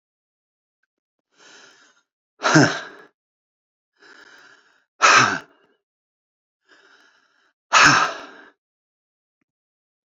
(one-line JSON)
{"exhalation_length": "10.1 s", "exhalation_amplitude": 30116, "exhalation_signal_mean_std_ratio": 0.26, "survey_phase": "beta (2021-08-13 to 2022-03-07)", "age": "45-64", "gender": "Male", "wearing_mask": "No", "symptom_shortness_of_breath": true, "symptom_headache": true, "symptom_onset": "12 days", "smoker_status": "Never smoked", "respiratory_condition_asthma": true, "respiratory_condition_other": false, "recruitment_source": "REACT", "submission_delay": "1 day", "covid_test_result": "Negative", "covid_test_method": "RT-qPCR"}